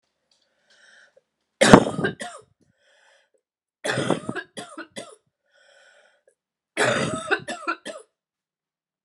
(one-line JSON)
{"three_cough_length": "9.0 s", "three_cough_amplitude": 32768, "three_cough_signal_mean_std_ratio": 0.27, "survey_phase": "beta (2021-08-13 to 2022-03-07)", "age": "45-64", "gender": "Female", "wearing_mask": "No", "symptom_runny_or_blocked_nose": true, "symptom_sore_throat": true, "symptom_headache": true, "symptom_onset": "7 days", "smoker_status": "Never smoked", "respiratory_condition_asthma": false, "respiratory_condition_other": false, "recruitment_source": "Test and Trace", "submission_delay": "2 days", "covid_test_result": "Positive", "covid_test_method": "RT-qPCR", "covid_ct_value": 15.2, "covid_ct_gene": "N gene", "covid_ct_mean": 16.1, "covid_viral_load": "5100000 copies/ml", "covid_viral_load_category": "High viral load (>1M copies/ml)"}